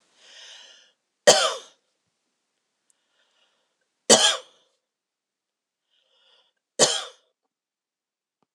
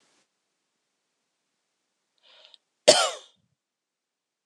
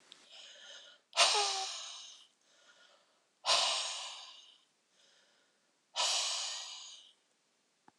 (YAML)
three_cough_length: 8.5 s
three_cough_amplitude: 26028
three_cough_signal_mean_std_ratio: 0.21
cough_length: 4.5 s
cough_amplitude: 26028
cough_signal_mean_std_ratio: 0.16
exhalation_length: 8.0 s
exhalation_amplitude: 7059
exhalation_signal_mean_std_ratio: 0.42
survey_phase: beta (2021-08-13 to 2022-03-07)
age: 45-64
gender: Female
wearing_mask: 'No'
symptom_none: true
smoker_status: Never smoked
respiratory_condition_asthma: true
respiratory_condition_other: false
recruitment_source: REACT
submission_delay: 2 days
covid_test_result: Negative
covid_test_method: RT-qPCR